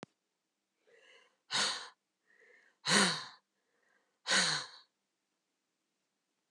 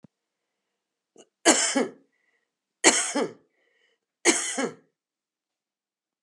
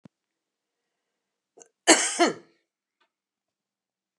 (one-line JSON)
{"exhalation_length": "6.5 s", "exhalation_amplitude": 11925, "exhalation_signal_mean_std_ratio": 0.31, "three_cough_length": "6.2 s", "three_cough_amplitude": 25817, "three_cough_signal_mean_std_ratio": 0.32, "cough_length": "4.2 s", "cough_amplitude": 28834, "cough_signal_mean_std_ratio": 0.21, "survey_phase": "beta (2021-08-13 to 2022-03-07)", "age": "65+", "gender": "Female", "wearing_mask": "No", "symptom_none": true, "smoker_status": "Current smoker (11 or more cigarettes per day)", "respiratory_condition_asthma": false, "respiratory_condition_other": false, "recruitment_source": "REACT", "submission_delay": "3 days", "covid_test_result": "Negative", "covid_test_method": "RT-qPCR"}